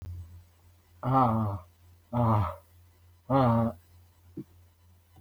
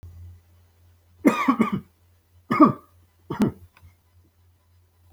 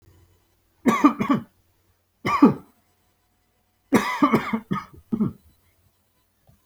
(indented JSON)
{
  "exhalation_length": "5.2 s",
  "exhalation_amplitude": 8242,
  "exhalation_signal_mean_std_ratio": 0.48,
  "cough_length": "5.1 s",
  "cough_amplitude": 26135,
  "cough_signal_mean_std_ratio": 0.31,
  "three_cough_length": "6.7 s",
  "three_cough_amplitude": 25839,
  "three_cough_signal_mean_std_ratio": 0.35,
  "survey_phase": "alpha (2021-03-01 to 2021-08-12)",
  "age": "45-64",
  "gender": "Male",
  "wearing_mask": "No",
  "symptom_none": true,
  "smoker_status": "Never smoked",
  "respiratory_condition_asthma": false,
  "respiratory_condition_other": false,
  "recruitment_source": "REACT",
  "submission_delay": "34 days",
  "covid_test_result": "Negative",
  "covid_test_method": "RT-qPCR"
}